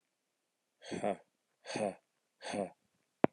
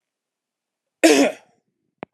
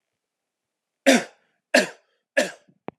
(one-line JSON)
{"exhalation_length": "3.3 s", "exhalation_amplitude": 12885, "exhalation_signal_mean_std_ratio": 0.28, "cough_length": "2.1 s", "cough_amplitude": 30446, "cough_signal_mean_std_ratio": 0.29, "three_cough_length": "3.0 s", "three_cough_amplitude": 28531, "three_cough_signal_mean_std_ratio": 0.27, "survey_phase": "beta (2021-08-13 to 2022-03-07)", "age": "18-44", "gender": "Male", "wearing_mask": "No", "symptom_cough_any": true, "symptom_runny_or_blocked_nose": true, "symptom_diarrhoea": true, "symptom_fatigue": true, "symptom_other": true, "symptom_onset": "2 days", "smoker_status": "Never smoked", "respiratory_condition_asthma": false, "respiratory_condition_other": false, "recruitment_source": "Test and Trace", "submission_delay": "2 days", "covid_test_result": "Positive", "covid_test_method": "RT-qPCR"}